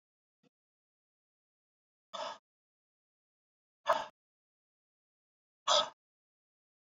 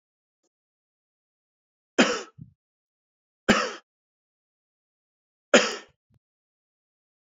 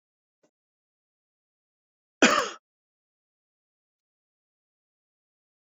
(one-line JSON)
{"exhalation_length": "7.0 s", "exhalation_amplitude": 6883, "exhalation_signal_mean_std_ratio": 0.19, "three_cough_length": "7.3 s", "three_cough_amplitude": 23365, "three_cough_signal_mean_std_ratio": 0.2, "cough_length": "5.6 s", "cough_amplitude": 19372, "cough_signal_mean_std_ratio": 0.15, "survey_phase": "beta (2021-08-13 to 2022-03-07)", "age": "45-64", "gender": "Male", "wearing_mask": "No", "symptom_none": true, "smoker_status": "Never smoked", "respiratory_condition_asthma": false, "respiratory_condition_other": false, "recruitment_source": "REACT", "submission_delay": "0 days", "covid_test_result": "Negative", "covid_test_method": "RT-qPCR"}